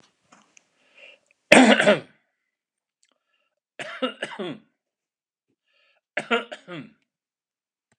{"three_cough_length": "8.0 s", "three_cough_amplitude": 32768, "three_cough_signal_mean_std_ratio": 0.23, "survey_phase": "alpha (2021-03-01 to 2021-08-12)", "age": "65+", "gender": "Male", "wearing_mask": "No", "symptom_none": true, "smoker_status": "Ex-smoker", "respiratory_condition_asthma": false, "respiratory_condition_other": false, "recruitment_source": "REACT", "submission_delay": "8 days", "covid_test_result": "Negative", "covid_test_method": "RT-qPCR"}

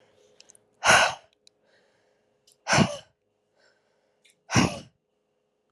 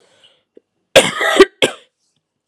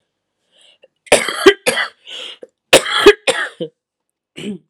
{"exhalation_length": "5.7 s", "exhalation_amplitude": 21857, "exhalation_signal_mean_std_ratio": 0.28, "three_cough_length": "2.5 s", "three_cough_amplitude": 32768, "three_cough_signal_mean_std_ratio": 0.32, "cough_length": "4.7 s", "cough_amplitude": 32768, "cough_signal_mean_std_ratio": 0.35, "survey_phase": "beta (2021-08-13 to 2022-03-07)", "age": "18-44", "gender": "Female", "wearing_mask": "No", "symptom_cough_any": true, "symptom_runny_or_blocked_nose": true, "symptom_fatigue": true, "symptom_headache": true, "symptom_onset": "1 day", "smoker_status": "Never smoked", "respiratory_condition_asthma": false, "respiratory_condition_other": false, "recruitment_source": "Test and Trace", "submission_delay": "1 day", "covid_test_result": "Positive", "covid_test_method": "RT-qPCR"}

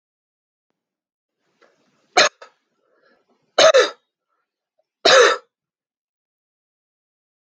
{"three_cough_length": "7.5 s", "three_cough_amplitude": 29886, "three_cough_signal_mean_std_ratio": 0.24, "survey_phase": "beta (2021-08-13 to 2022-03-07)", "age": "45-64", "gender": "Male", "wearing_mask": "No", "symptom_none": true, "smoker_status": "Ex-smoker", "respiratory_condition_asthma": false, "respiratory_condition_other": false, "recruitment_source": "REACT", "submission_delay": "1 day", "covid_test_result": "Negative", "covid_test_method": "RT-qPCR"}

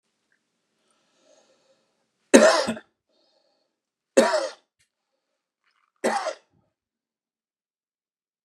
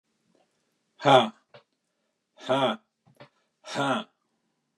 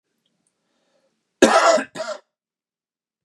{"three_cough_length": "8.4 s", "three_cough_amplitude": 32768, "three_cough_signal_mean_std_ratio": 0.23, "exhalation_length": "4.8 s", "exhalation_amplitude": 22733, "exhalation_signal_mean_std_ratio": 0.3, "cough_length": "3.2 s", "cough_amplitude": 32768, "cough_signal_mean_std_ratio": 0.3, "survey_phase": "beta (2021-08-13 to 2022-03-07)", "age": "45-64", "gender": "Male", "wearing_mask": "No", "symptom_none": true, "smoker_status": "Ex-smoker", "respiratory_condition_asthma": false, "respiratory_condition_other": false, "recruitment_source": "REACT", "submission_delay": "2 days", "covid_test_result": "Negative", "covid_test_method": "RT-qPCR", "influenza_a_test_result": "Negative", "influenza_b_test_result": "Negative"}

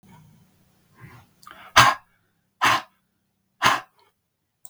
{"exhalation_length": "4.7 s", "exhalation_amplitude": 32768, "exhalation_signal_mean_std_ratio": 0.26, "survey_phase": "beta (2021-08-13 to 2022-03-07)", "age": "45-64", "gender": "Male", "wearing_mask": "No", "symptom_none": true, "smoker_status": "Never smoked", "respiratory_condition_asthma": true, "respiratory_condition_other": false, "recruitment_source": "REACT", "submission_delay": "2 days", "covid_test_result": "Negative", "covid_test_method": "RT-qPCR", "influenza_a_test_result": "Negative", "influenza_b_test_result": "Negative"}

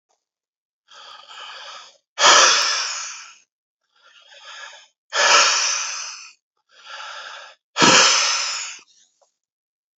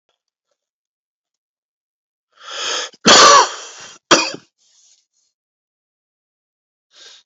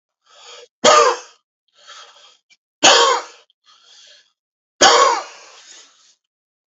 {"exhalation_length": "10.0 s", "exhalation_amplitude": 31449, "exhalation_signal_mean_std_ratio": 0.42, "cough_length": "7.3 s", "cough_amplitude": 32768, "cough_signal_mean_std_ratio": 0.27, "three_cough_length": "6.7 s", "three_cough_amplitude": 32768, "three_cough_signal_mean_std_ratio": 0.34, "survey_phase": "beta (2021-08-13 to 2022-03-07)", "age": "45-64", "gender": "Male", "wearing_mask": "No", "symptom_cough_any": true, "symptom_runny_or_blocked_nose": true, "symptom_shortness_of_breath": true, "symptom_abdominal_pain": true, "symptom_fatigue": true, "symptom_headache": true, "symptom_change_to_sense_of_smell_or_taste": true, "symptom_loss_of_taste": true, "symptom_onset": "3 days", "smoker_status": "Ex-smoker", "respiratory_condition_asthma": false, "respiratory_condition_other": false, "recruitment_source": "Test and Trace", "submission_delay": "2 days", "covid_test_result": "Positive", "covid_test_method": "RT-qPCR", "covid_ct_value": 21.8, "covid_ct_gene": "ORF1ab gene", "covid_ct_mean": 22.1, "covid_viral_load": "59000 copies/ml", "covid_viral_load_category": "Low viral load (10K-1M copies/ml)"}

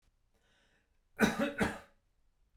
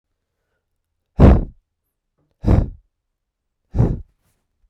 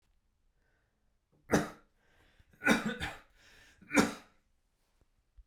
{"cough_length": "2.6 s", "cough_amplitude": 6361, "cough_signal_mean_std_ratio": 0.33, "exhalation_length": "4.7 s", "exhalation_amplitude": 32768, "exhalation_signal_mean_std_ratio": 0.28, "three_cough_length": "5.5 s", "three_cough_amplitude": 8927, "three_cough_signal_mean_std_ratio": 0.28, "survey_phase": "beta (2021-08-13 to 2022-03-07)", "age": "18-44", "gender": "Male", "wearing_mask": "No", "symptom_none": true, "symptom_onset": "12 days", "smoker_status": "Never smoked", "respiratory_condition_asthma": true, "respiratory_condition_other": false, "recruitment_source": "REACT", "submission_delay": "3 days", "covid_test_result": "Negative", "covid_test_method": "RT-qPCR", "influenza_a_test_result": "Negative", "influenza_b_test_result": "Negative"}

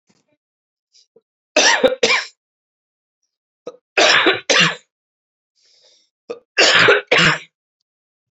{"three_cough_length": "8.4 s", "three_cough_amplitude": 32102, "three_cough_signal_mean_std_ratio": 0.39, "survey_phase": "beta (2021-08-13 to 2022-03-07)", "age": "45-64", "gender": "Male", "wearing_mask": "Yes", "symptom_cough_any": true, "symptom_runny_or_blocked_nose": true, "symptom_fever_high_temperature": true, "symptom_headache": true, "symptom_change_to_sense_of_smell_or_taste": true, "symptom_onset": "3 days", "smoker_status": "Never smoked", "respiratory_condition_asthma": false, "respiratory_condition_other": false, "recruitment_source": "Test and Trace", "submission_delay": "2 days", "covid_test_result": "Positive", "covid_test_method": "RT-qPCR"}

